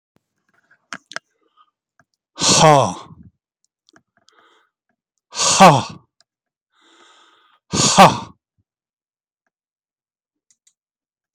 {"exhalation_length": "11.3 s", "exhalation_amplitude": 32768, "exhalation_signal_mean_std_ratio": 0.26, "survey_phase": "beta (2021-08-13 to 2022-03-07)", "age": "65+", "gender": "Male", "wearing_mask": "No", "symptom_none": true, "smoker_status": "Ex-smoker", "respiratory_condition_asthma": false, "respiratory_condition_other": true, "recruitment_source": "Test and Trace", "submission_delay": "1 day", "covid_test_result": "Negative", "covid_test_method": "ePCR"}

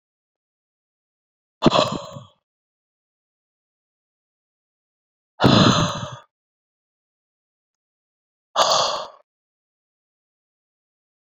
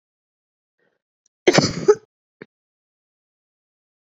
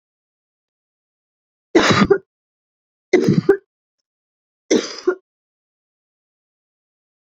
{"exhalation_length": "11.3 s", "exhalation_amplitude": 27382, "exhalation_signal_mean_std_ratio": 0.26, "cough_length": "4.0 s", "cough_amplitude": 28092, "cough_signal_mean_std_ratio": 0.21, "three_cough_length": "7.3 s", "three_cough_amplitude": 29798, "three_cough_signal_mean_std_ratio": 0.28, "survey_phase": "beta (2021-08-13 to 2022-03-07)", "age": "18-44", "gender": "Female", "wearing_mask": "No", "symptom_cough_any": true, "symptom_shortness_of_breath": true, "symptom_fatigue": true, "symptom_headache": true, "symptom_change_to_sense_of_smell_or_taste": true, "symptom_loss_of_taste": true, "symptom_other": true, "symptom_onset": "8 days", "smoker_status": "Current smoker (1 to 10 cigarettes per day)", "respiratory_condition_asthma": false, "respiratory_condition_other": false, "recruitment_source": "Test and Trace", "submission_delay": "1 day", "covid_test_result": "Positive", "covid_test_method": "RT-qPCR", "covid_ct_value": 22.2, "covid_ct_gene": "ORF1ab gene", "covid_ct_mean": 22.9, "covid_viral_load": "32000 copies/ml", "covid_viral_load_category": "Low viral load (10K-1M copies/ml)"}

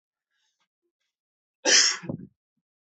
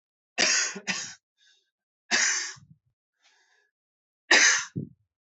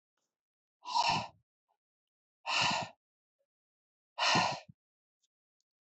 {"cough_length": "2.8 s", "cough_amplitude": 16793, "cough_signal_mean_std_ratio": 0.28, "three_cough_length": "5.4 s", "three_cough_amplitude": 16699, "three_cough_signal_mean_std_ratio": 0.37, "exhalation_length": "5.8 s", "exhalation_amplitude": 5874, "exhalation_signal_mean_std_ratio": 0.36, "survey_phase": "alpha (2021-03-01 to 2021-08-12)", "age": "18-44", "gender": "Male", "wearing_mask": "No", "symptom_cough_any": true, "symptom_new_continuous_cough": true, "symptom_fever_high_temperature": true, "symptom_headache": true, "symptom_onset": "4 days", "smoker_status": "Never smoked", "respiratory_condition_asthma": false, "respiratory_condition_other": false, "recruitment_source": "Test and Trace", "submission_delay": "2 days", "covid_test_result": "Positive", "covid_test_method": "RT-qPCR"}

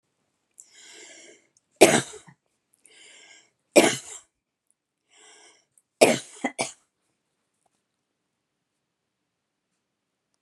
{"three_cough_length": "10.4 s", "three_cough_amplitude": 32768, "three_cough_signal_mean_std_ratio": 0.19, "survey_phase": "beta (2021-08-13 to 2022-03-07)", "age": "65+", "gender": "Female", "wearing_mask": "No", "symptom_none": true, "smoker_status": "Never smoked", "respiratory_condition_asthma": false, "respiratory_condition_other": false, "recruitment_source": "REACT", "submission_delay": "0 days", "covid_test_result": "Negative", "covid_test_method": "RT-qPCR"}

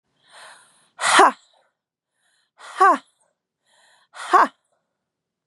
{"exhalation_length": "5.5 s", "exhalation_amplitude": 32169, "exhalation_signal_mean_std_ratio": 0.28, "survey_phase": "beta (2021-08-13 to 2022-03-07)", "age": "18-44", "gender": "Female", "wearing_mask": "No", "symptom_none": true, "symptom_onset": "11 days", "smoker_status": "Never smoked", "respiratory_condition_asthma": false, "respiratory_condition_other": false, "recruitment_source": "REACT", "submission_delay": "3 days", "covid_test_result": "Negative", "covid_test_method": "RT-qPCR", "influenza_a_test_result": "Negative", "influenza_b_test_result": "Negative"}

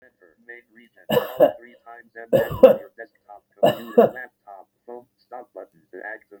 {"three_cough_length": "6.4 s", "three_cough_amplitude": 32768, "three_cough_signal_mean_std_ratio": 0.3, "survey_phase": "beta (2021-08-13 to 2022-03-07)", "age": "65+", "gender": "Male", "wearing_mask": "No", "symptom_runny_or_blocked_nose": true, "symptom_shortness_of_breath": true, "smoker_status": "Ex-smoker", "respiratory_condition_asthma": false, "respiratory_condition_other": false, "recruitment_source": "REACT", "submission_delay": "1 day", "covid_test_result": "Negative", "covid_test_method": "RT-qPCR", "influenza_a_test_result": "Negative", "influenza_b_test_result": "Negative"}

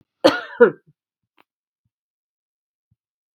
{"cough_length": "3.3 s", "cough_amplitude": 32768, "cough_signal_mean_std_ratio": 0.2, "survey_phase": "beta (2021-08-13 to 2022-03-07)", "age": "45-64", "gender": "Female", "wearing_mask": "No", "symptom_runny_or_blocked_nose": true, "symptom_change_to_sense_of_smell_or_taste": true, "symptom_loss_of_taste": true, "smoker_status": "Never smoked", "respiratory_condition_asthma": false, "respiratory_condition_other": false, "recruitment_source": "Test and Trace", "submission_delay": "2 days", "covid_test_result": "Positive", "covid_test_method": "RT-qPCR"}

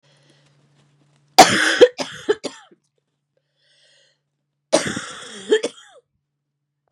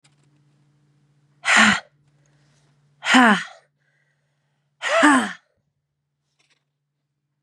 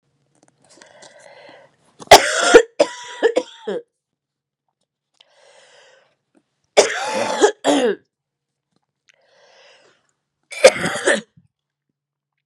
{"cough_length": "6.9 s", "cough_amplitude": 32768, "cough_signal_mean_std_ratio": 0.26, "exhalation_length": "7.4 s", "exhalation_amplitude": 31182, "exhalation_signal_mean_std_ratio": 0.31, "three_cough_length": "12.5 s", "three_cough_amplitude": 32768, "three_cough_signal_mean_std_ratio": 0.28, "survey_phase": "beta (2021-08-13 to 2022-03-07)", "age": "18-44", "gender": "Female", "wearing_mask": "No", "symptom_cough_any": true, "symptom_runny_or_blocked_nose": true, "symptom_sore_throat": true, "symptom_abdominal_pain": true, "symptom_diarrhoea": true, "symptom_fatigue": true, "symptom_fever_high_temperature": true, "symptom_headache": true, "symptom_change_to_sense_of_smell_or_taste": true, "symptom_loss_of_taste": true, "symptom_onset": "2 days", "smoker_status": "Ex-smoker", "respiratory_condition_asthma": true, "respiratory_condition_other": false, "recruitment_source": "Test and Trace", "submission_delay": "2 days", "covid_test_result": "Positive", "covid_test_method": "RT-qPCR", "covid_ct_value": 21.6, "covid_ct_gene": "N gene"}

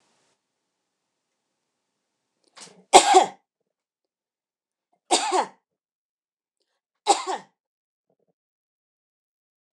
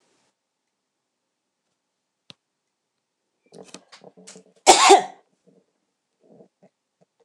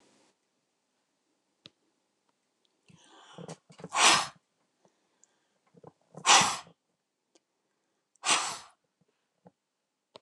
{"three_cough_length": "9.8 s", "three_cough_amplitude": 29204, "three_cough_signal_mean_std_ratio": 0.2, "cough_length": "7.2 s", "cough_amplitude": 29204, "cough_signal_mean_std_ratio": 0.17, "exhalation_length": "10.2 s", "exhalation_amplitude": 17978, "exhalation_signal_mean_std_ratio": 0.23, "survey_phase": "beta (2021-08-13 to 2022-03-07)", "age": "45-64", "gender": "Female", "wearing_mask": "No", "symptom_none": true, "smoker_status": "Never smoked", "respiratory_condition_asthma": false, "respiratory_condition_other": false, "recruitment_source": "REACT", "submission_delay": "2 days", "covid_test_result": "Negative", "covid_test_method": "RT-qPCR", "influenza_a_test_result": "Negative", "influenza_b_test_result": "Negative"}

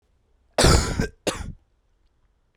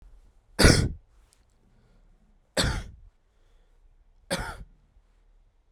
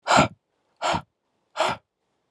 {"cough_length": "2.6 s", "cough_amplitude": 23860, "cough_signal_mean_std_ratio": 0.37, "three_cough_length": "5.7 s", "three_cough_amplitude": 23137, "three_cough_signal_mean_std_ratio": 0.27, "exhalation_length": "2.3 s", "exhalation_amplitude": 20155, "exhalation_signal_mean_std_ratio": 0.37, "survey_phase": "alpha (2021-03-01 to 2021-08-12)", "age": "18-44", "gender": "Male", "wearing_mask": "No", "symptom_cough_any": true, "symptom_new_continuous_cough": true, "symptom_onset": "6 days", "smoker_status": "Current smoker (e-cigarettes or vapes only)", "respiratory_condition_asthma": false, "respiratory_condition_other": false, "recruitment_source": "Test and Trace", "submission_delay": "2 days", "covid_test_result": "Positive", "covid_test_method": "RT-qPCR", "covid_ct_value": 37.5, "covid_ct_gene": "N gene"}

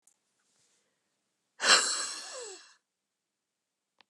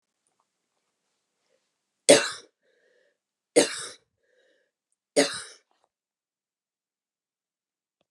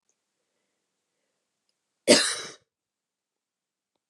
{"exhalation_length": "4.1 s", "exhalation_amplitude": 14630, "exhalation_signal_mean_std_ratio": 0.27, "three_cough_length": "8.1 s", "three_cough_amplitude": 29384, "three_cough_signal_mean_std_ratio": 0.18, "cough_length": "4.1 s", "cough_amplitude": 25261, "cough_signal_mean_std_ratio": 0.19, "survey_phase": "beta (2021-08-13 to 2022-03-07)", "age": "45-64", "gender": "Female", "wearing_mask": "No", "symptom_none": true, "smoker_status": "Never smoked", "respiratory_condition_asthma": true, "respiratory_condition_other": false, "recruitment_source": "REACT", "submission_delay": "2 days", "covid_test_result": "Negative", "covid_test_method": "RT-qPCR"}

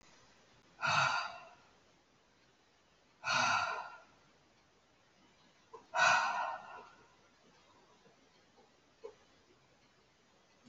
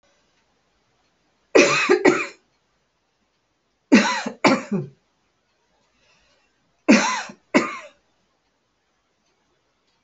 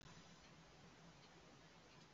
{"exhalation_length": "10.7 s", "exhalation_amplitude": 5027, "exhalation_signal_mean_std_ratio": 0.35, "cough_length": "10.0 s", "cough_amplitude": 32768, "cough_signal_mean_std_ratio": 0.31, "three_cough_length": "2.1 s", "three_cough_amplitude": 114, "three_cough_signal_mean_std_ratio": 1.22, "survey_phase": "beta (2021-08-13 to 2022-03-07)", "age": "65+", "gender": "Female", "wearing_mask": "No", "symptom_abdominal_pain": true, "symptom_diarrhoea": true, "smoker_status": "Never smoked", "respiratory_condition_asthma": false, "respiratory_condition_other": false, "recruitment_source": "REACT", "submission_delay": "1 day", "covid_test_result": "Negative", "covid_test_method": "RT-qPCR"}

